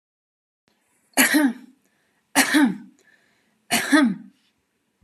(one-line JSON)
{"three_cough_length": "5.0 s", "three_cough_amplitude": 28138, "three_cough_signal_mean_std_ratio": 0.4, "survey_phase": "beta (2021-08-13 to 2022-03-07)", "age": "18-44", "gender": "Female", "wearing_mask": "No", "symptom_none": true, "smoker_status": "Never smoked", "respiratory_condition_asthma": false, "respiratory_condition_other": false, "recruitment_source": "REACT", "submission_delay": "9 days", "covid_test_result": "Negative", "covid_test_method": "RT-qPCR"}